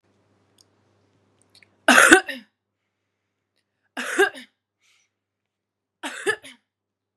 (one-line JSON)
{"three_cough_length": "7.2 s", "three_cough_amplitude": 32768, "three_cough_signal_mean_std_ratio": 0.23, "survey_phase": "beta (2021-08-13 to 2022-03-07)", "age": "18-44", "gender": "Female", "wearing_mask": "No", "symptom_cough_any": true, "symptom_new_continuous_cough": true, "symptom_runny_or_blocked_nose": true, "symptom_sore_throat": true, "symptom_fatigue": true, "symptom_headache": true, "symptom_loss_of_taste": true, "symptom_onset": "3 days", "smoker_status": "Never smoked", "respiratory_condition_asthma": false, "respiratory_condition_other": false, "recruitment_source": "Test and Trace", "submission_delay": "1 day", "covid_test_result": "Negative", "covid_test_method": "RT-qPCR"}